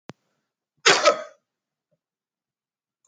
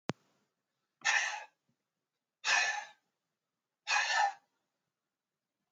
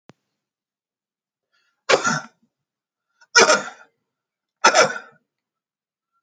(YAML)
cough_length: 3.1 s
cough_amplitude: 26028
cough_signal_mean_std_ratio: 0.23
exhalation_length: 5.7 s
exhalation_amplitude: 6758
exhalation_signal_mean_std_ratio: 0.37
three_cough_length: 6.2 s
three_cough_amplitude: 32767
three_cough_signal_mean_std_ratio: 0.27
survey_phase: alpha (2021-03-01 to 2021-08-12)
age: 45-64
gender: Male
wearing_mask: 'No'
symptom_fatigue: true
smoker_status: Never smoked
respiratory_condition_asthma: false
respiratory_condition_other: false
recruitment_source: REACT
submission_delay: 2 days
covid_test_result: Negative
covid_test_method: RT-qPCR